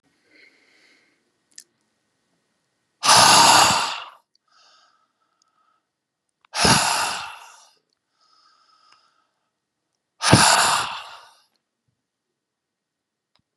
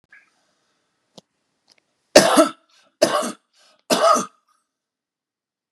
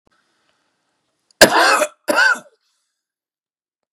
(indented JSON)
{
  "exhalation_length": "13.6 s",
  "exhalation_amplitude": 32754,
  "exhalation_signal_mean_std_ratio": 0.31,
  "three_cough_length": "5.7 s",
  "three_cough_amplitude": 32768,
  "three_cough_signal_mean_std_ratio": 0.29,
  "cough_length": "3.9 s",
  "cough_amplitude": 32768,
  "cough_signal_mean_std_ratio": 0.33,
  "survey_phase": "beta (2021-08-13 to 2022-03-07)",
  "age": "65+",
  "gender": "Male",
  "wearing_mask": "No",
  "symptom_none": true,
  "smoker_status": "Ex-smoker",
  "respiratory_condition_asthma": false,
  "respiratory_condition_other": false,
  "recruitment_source": "REACT",
  "submission_delay": "2 days",
  "covid_test_result": "Negative",
  "covid_test_method": "RT-qPCR",
  "influenza_a_test_result": "Negative",
  "influenza_b_test_result": "Negative"
}